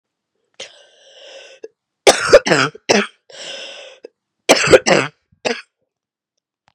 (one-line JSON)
{"cough_length": "6.7 s", "cough_amplitude": 32768, "cough_signal_mean_std_ratio": 0.32, "survey_phase": "beta (2021-08-13 to 2022-03-07)", "age": "18-44", "gender": "Female", "wearing_mask": "No", "symptom_cough_any": true, "symptom_new_continuous_cough": true, "symptom_runny_or_blocked_nose": true, "symptom_onset": "6 days", "smoker_status": "Never smoked", "respiratory_condition_asthma": false, "respiratory_condition_other": false, "recruitment_source": "Test and Trace", "submission_delay": "2 days", "covid_test_result": "Positive", "covid_test_method": "RT-qPCR", "covid_ct_value": 25.2, "covid_ct_gene": "ORF1ab gene", "covid_ct_mean": 25.6, "covid_viral_load": "4000 copies/ml", "covid_viral_load_category": "Minimal viral load (< 10K copies/ml)"}